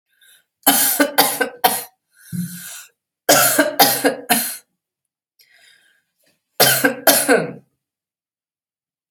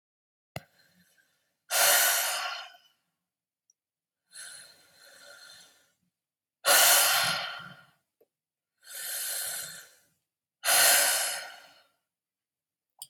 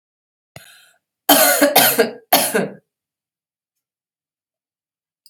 {
  "three_cough_length": "9.1 s",
  "three_cough_amplitude": 32768,
  "three_cough_signal_mean_std_ratio": 0.43,
  "exhalation_length": "13.1 s",
  "exhalation_amplitude": 13127,
  "exhalation_signal_mean_std_ratio": 0.38,
  "cough_length": "5.3 s",
  "cough_amplitude": 32768,
  "cough_signal_mean_std_ratio": 0.36,
  "survey_phase": "alpha (2021-03-01 to 2021-08-12)",
  "age": "18-44",
  "gender": "Female",
  "wearing_mask": "No",
  "symptom_cough_any": true,
  "symptom_onset": "9 days",
  "smoker_status": "Never smoked",
  "respiratory_condition_asthma": true,
  "respiratory_condition_other": false,
  "recruitment_source": "REACT",
  "submission_delay": "1 day",
  "covid_test_result": "Negative",
  "covid_test_method": "RT-qPCR"
}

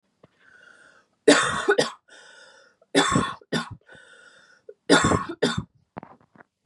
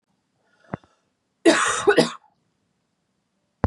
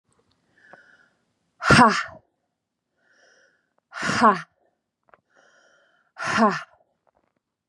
{
  "three_cough_length": "6.7 s",
  "three_cough_amplitude": 25165,
  "three_cough_signal_mean_std_ratio": 0.37,
  "cough_length": "3.7 s",
  "cough_amplitude": 25225,
  "cough_signal_mean_std_ratio": 0.3,
  "exhalation_length": "7.7 s",
  "exhalation_amplitude": 27656,
  "exhalation_signal_mean_std_ratio": 0.28,
  "survey_phase": "beta (2021-08-13 to 2022-03-07)",
  "age": "45-64",
  "gender": "Female",
  "wearing_mask": "No",
  "symptom_runny_or_blocked_nose": true,
  "symptom_headache": true,
  "smoker_status": "Never smoked",
  "respiratory_condition_asthma": false,
  "respiratory_condition_other": false,
  "recruitment_source": "Test and Trace",
  "submission_delay": "-1 day",
  "covid_test_result": "Positive",
  "covid_test_method": "LFT"
}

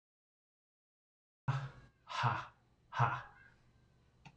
{
  "exhalation_length": "4.4 s",
  "exhalation_amplitude": 4103,
  "exhalation_signal_mean_std_ratio": 0.35,
  "survey_phase": "beta (2021-08-13 to 2022-03-07)",
  "age": "45-64",
  "gender": "Male",
  "wearing_mask": "No",
  "symptom_none": true,
  "smoker_status": "Ex-smoker",
  "respiratory_condition_asthma": false,
  "respiratory_condition_other": false,
  "recruitment_source": "REACT",
  "submission_delay": "3 days",
  "covid_test_result": "Negative",
  "covid_test_method": "RT-qPCR",
  "influenza_a_test_result": "Negative",
  "influenza_b_test_result": "Negative"
}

